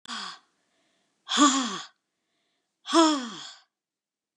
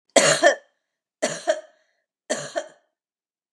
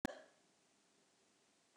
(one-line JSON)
{"exhalation_length": "4.4 s", "exhalation_amplitude": 18269, "exhalation_signal_mean_std_ratio": 0.36, "three_cough_length": "3.5 s", "three_cough_amplitude": 32088, "three_cough_signal_mean_std_ratio": 0.34, "cough_length": "1.8 s", "cough_amplitude": 2128, "cough_signal_mean_std_ratio": 0.19, "survey_phase": "beta (2021-08-13 to 2022-03-07)", "age": "65+", "gender": "Female", "wearing_mask": "No", "symptom_none": true, "smoker_status": "Never smoked", "respiratory_condition_asthma": false, "respiratory_condition_other": false, "recruitment_source": "REACT", "submission_delay": "1 day", "covid_test_result": "Negative", "covid_test_method": "RT-qPCR", "influenza_a_test_result": "Negative", "influenza_b_test_result": "Negative"}